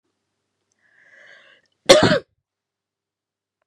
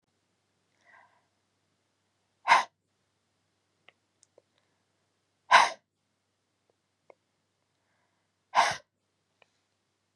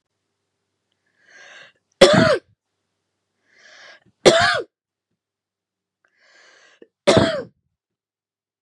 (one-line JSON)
{"cough_length": "3.7 s", "cough_amplitude": 32768, "cough_signal_mean_std_ratio": 0.21, "exhalation_length": "10.2 s", "exhalation_amplitude": 16762, "exhalation_signal_mean_std_ratio": 0.17, "three_cough_length": "8.6 s", "three_cough_amplitude": 32768, "three_cough_signal_mean_std_ratio": 0.27, "survey_phase": "beta (2021-08-13 to 2022-03-07)", "age": "18-44", "gender": "Female", "wearing_mask": "No", "symptom_cough_any": true, "symptom_runny_or_blocked_nose": true, "symptom_sore_throat": true, "symptom_fatigue": true, "symptom_fever_high_temperature": true, "symptom_headache": true, "symptom_change_to_sense_of_smell_or_taste": true, "symptom_other": true, "symptom_onset": "5 days", "smoker_status": "Never smoked", "respiratory_condition_asthma": false, "respiratory_condition_other": false, "recruitment_source": "Test and Trace", "submission_delay": "2 days", "covid_test_result": "Positive", "covid_test_method": "ePCR"}